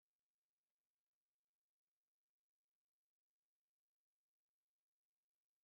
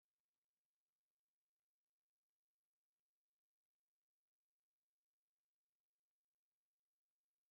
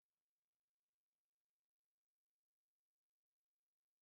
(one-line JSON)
{"three_cough_length": "5.6 s", "three_cough_amplitude": 2, "three_cough_signal_mean_std_ratio": 0.12, "exhalation_length": "7.5 s", "exhalation_amplitude": 2, "exhalation_signal_mean_std_ratio": 0.13, "cough_length": "4.0 s", "cough_amplitude": 2, "cough_signal_mean_std_ratio": 0.13, "survey_phase": "alpha (2021-03-01 to 2021-08-12)", "age": "65+", "gender": "Male", "wearing_mask": "No", "symptom_none": true, "smoker_status": "Ex-smoker", "respiratory_condition_asthma": false, "respiratory_condition_other": false, "recruitment_source": "REACT", "submission_delay": "2 days", "covid_test_result": "Negative", "covid_test_method": "RT-qPCR"}